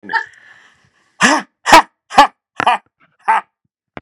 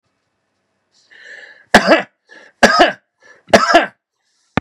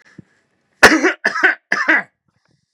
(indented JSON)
{
  "exhalation_length": "4.0 s",
  "exhalation_amplitude": 32768,
  "exhalation_signal_mean_std_ratio": 0.35,
  "three_cough_length": "4.6 s",
  "three_cough_amplitude": 32768,
  "three_cough_signal_mean_std_ratio": 0.34,
  "cough_length": "2.7 s",
  "cough_amplitude": 32768,
  "cough_signal_mean_std_ratio": 0.4,
  "survey_phase": "beta (2021-08-13 to 2022-03-07)",
  "age": "18-44",
  "gender": "Male",
  "wearing_mask": "No",
  "symptom_none": true,
  "smoker_status": "Never smoked",
  "respiratory_condition_asthma": false,
  "respiratory_condition_other": false,
  "recruitment_source": "Test and Trace",
  "submission_delay": "1 day",
  "covid_test_result": "Positive",
  "covid_test_method": "RT-qPCR",
  "covid_ct_value": 19.7,
  "covid_ct_gene": "ORF1ab gene"
}